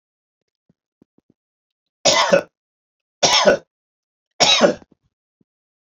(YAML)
three_cough_length: 5.9 s
three_cough_amplitude: 31715
three_cough_signal_mean_std_ratio: 0.33
survey_phase: beta (2021-08-13 to 2022-03-07)
age: 65+
gender: Male
wearing_mask: 'No'
symptom_none: true
smoker_status: Ex-smoker
respiratory_condition_asthma: false
respiratory_condition_other: false
recruitment_source: REACT
submission_delay: 2 days
covid_test_result: Negative
covid_test_method: RT-qPCR
influenza_a_test_result: Negative
influenza_b_test_result: Negative